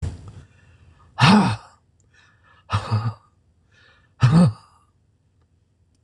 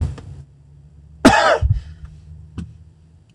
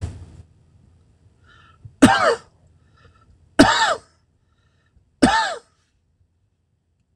exhalation_length: 6.0 s
exhalation_amplitude: 25968
exhalation_signal_mean_std_ratio: 0.35
cough_length: 3.3 s
cough_amplitude: 26028
cough_signal_mean_std_ratio: 0.4
three_cough_length: 7.2 s
three_cough_amplitude: 26028
three_cough_signal_mean_std_ratio: 0.3
survey_phase: beta (2021-08-13 to 2022-03-07)
age: 65+
gender: Male
wearing_mask: 'No'
symptom_none: true
smoker_status: Never smoked
respiratory_condition_asthma: false
respiratory_condition_other: false
recruitment_source: REACT
submission_delay: 3 days
covid_test_result: Negative
covid_test_method: RT-qPCR
influenza_a_test_result: Negative
influenza_b_test_result: Negative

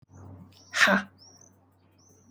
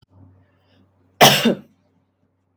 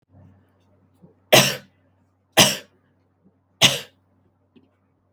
exhalation_length: 2.3 s
exhalation_amplitude: 15809
exhalation_signal_mean_std_ratio: 0.31
cough_length: 2.6 s
cough_amplitude: 32767
cough_signal_mean_std_ratio: 0.27
three_cough_length: 5.1 s
three_cough_amplitude: 32767
three_cough_signal_mean_std_ratio: 0.24
survey_phase: alpha (2021-03-01 to 2021-08-12)
age: 18-44
gender: Female
wearing_mask: 'No'
symptom_none: true
smoker_status: Never smoked
respiratory_condition_asthma: true
respiratory_condition_other: false
recruitment_source: REACT
submission_delay: 21 days
covid_test_result: Negative
covid_test_method: RT-qPCR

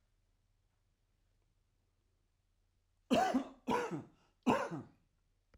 three_cough_length: 5.6 s
three_cough_amplitude: 4419
three_cough_signal_mean_std_ratio: 0.33
survey_phase: alpha (2021-03-01 to 2021-08-12)
age: 65+
gender: Male
wearing_mask: 'No'
symptom_none: true
smoker_status: Never smoked
respiratory_condition_asthma: false
respiratory_condition_other: false
recruitment_source: REACT
submission_delay: 2 days
covid_test_result: Negative
covid_test_method: RT-qPCR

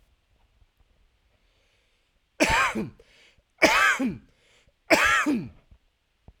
three_cough_length: 6.4 s
three_cough_amplitude: 23695
three_cough_signal_mean_std_ratio: 0.39
survey_phase: alpha (2021-03-01 to 2021-08-12)
age: 18-44
gender: Male
wearing_mask: 'No'
symptom_none: true
smoker_status: Current smoker (11 or more cigarettes per day)
respiratory_condition_asthma: false
respiratory_condition_other: false
recruitment_source: REACT
submission_delay: 0 days
covid_test_result: Negative
covid_test_method: RT-qPCR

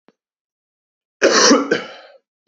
cough_length: 2.5 s
cough_amplitude: 31903
cough_signal_mean_std_ratio: 0.38
survey_phase: beta (2021-08-13 to 2022-03-07)
age: 18-44
gender: Male
wearing_mask: 'No'
symptom_cough_any: true
symptom_sore_throat: true
smoker_status: Never smoked
respiratory_condition_asthma: true
respiratory_condition_other: false
recruitment_source: REACT
submission_delay: 1 day
covid_test_result: Negative
covid_test_method: RT-qPCR
influenza_a_test_result: Negative
influenza_b_test_result: Negative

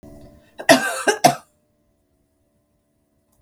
cough_length: 3.4 s
cough_amplitude: 32768
cough_signal_mean_std_ratio: 0.27
survey_phase: beta (2021-08-13 to 2022-03-07)
age: 65+
gender: Female
wearing_mask: 'No'
symptom_cough_any: true
symptom_runny_or_blocked_nose: true
smoker_status: Ex-smoker
respiratory_condition_asthma: false
respiratory_condition_other: false
recruitment_source: Test and Trace
submission_delay: 1 day
covid_test_result: Positive
covid_test_method: RT-qPCR
covid_ct_value: 19.0
covid_ct_gene: ORF1ab gene
covid_ct_mean: 19.6
covid_viral_load: 380000 copies/ml
covid_viral_load_category: Low viral load (10K-1M copies/ml)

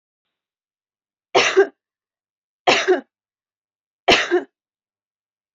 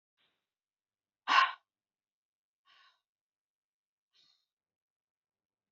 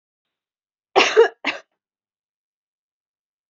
three_cough_length: 5.5 s
three_cough_amplitude: 28317
three_cough_signal_mean_std_ratio: 0.31
exhalation_length: 5.7 s
exhalation_amplitude: 8696
exhalation_signal_mean_std_ratio: 0.15
cough_length: 3.5 s
cough_amplitude: 30798
cough_signal_mean_std_ratio: 0.24
survey_phase: alpha (2021-03-01 to 2021-08-12)
age: 18-44
gender: Female
wearing_mask: 'No'
symptom_headache: true
smoker_status: Ex-smoker
respiratory_condition_asthma: false
respiratory_condition_other: false
recruitment_source: REACT
submission_delay: 1 day
covid_test_result: Negative
covid_test_method: RT-qPCR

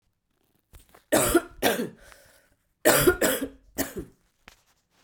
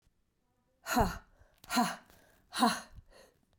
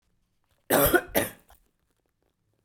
three_cough_length: 5.0 s
three_cough_amplitude: 21709
three_cough_signal_mean_std_ratio: 0.39
exhalation_length: 3.6 s
exhalation_amplitude: 7220
exhalation_signal_mean_std_ratio: 0.36
cough_length: 2.6 s
cough_amplitude: 15861
cough_signal_mean_std_ratio: 0.32
survey_phase: beta (2021-08-13 to 2022-03-07)
age: 18-44
gender: Female
wearing_mask: 'No'
symptom_cough_any: true
symptom_runny_or_blocked_nose: true
symptom_fatigue: true
symptom_headache: true
smoker_status: Never smoked
respiratory_condition_asthma: false
respiratory_condition_other: false
recruitment_source: REACT
submission_delay: 0 days
covid_test_result: Positive
covid_test_method: RT-qPCR
covid_ct_value: 26.0
covid_ct_gene: E gene
influenza_a_test_result: Unknown/Void
influenza_b_test_result: Unknown/Void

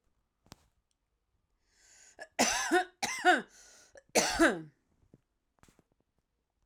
three_cough_length: 6.7 s
three_cough_amplitude: 8477
three_cough_signal_mean_std_ratio: 0.32
survey_phase: alpha (2021-03-01 to 2021-08-12)
age: 45-64
gender: Female
wearing_mask: 'No'
symptom_none: true
smoker_status: Never smoked
respiratory_condition_asthma: false
respiratory_condition_other: false
recruitment_source: REACT
submission_delay: 2 days
covid_test_result: Negative
covid_test_method: RT-qPCR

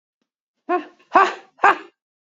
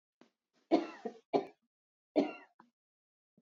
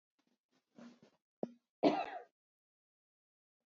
exhalation_length: 2.4 s
exhalation_amplitude: 31283
exhalation_signal_mean_std_ratio: 0.3
three_cough_length: 3.4 s
three_cough_amplitude: 6012
three_cough_signal_mean_std_ratio: 0.27
cough_length: 3.7 s
cough_amplitude: 4962
cough_signal_mean_std_ratio: 0.22
survey_phase: beta (2021-08-13 to 2022-03-07)
age: 45-64
gender: Female
wearing_mask: 'No'
symptom_runny_or_blocked_nose: true
symptom_sore_throat: true
symptom_fever_high_temperature: true
symptom_headache: true
symptom_onset: 2 days
smoker_status: Never smoked
respiratory_condition_asthma: false
respiratory_condition_other: false
recruitment_source: Test and Trace
submission_delay: 1 day
covid_test_result: Positive
covid_test_method: RT-qPCR
covid_ct_value: 27.2
covid_ct_gene: ORF1ab gene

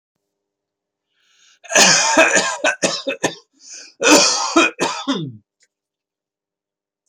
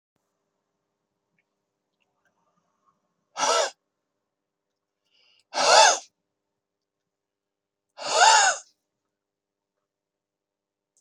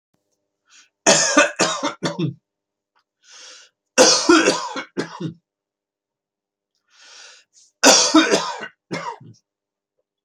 cough_length: 7.1 s
cough_amplitude: 32767
cough_signal_mean_std_ratio: 0.45
exhalation_length: 11.0 s
exhalation_amplitude: 22618
exhalation_signal_mean_std_ratio: 0.25
three_cough_length: 10.2 s
three_cough_amplitude: 32090
three_cough_signal_mean_std_ratio: 0.38
survey_phase: beta (2021-08-13 to 2022-03-07)
age: 45-64
gender: Male
wearing_mask: 'No'
symptom_none: true
smoker_status: Never smoked
respiratory_condition_asthma: false
respiratory_condition_other: false
recruitment_source: REACT
submission_delay: 3 days
covid_test_result: Negative
covid_test_method: RT-qPCR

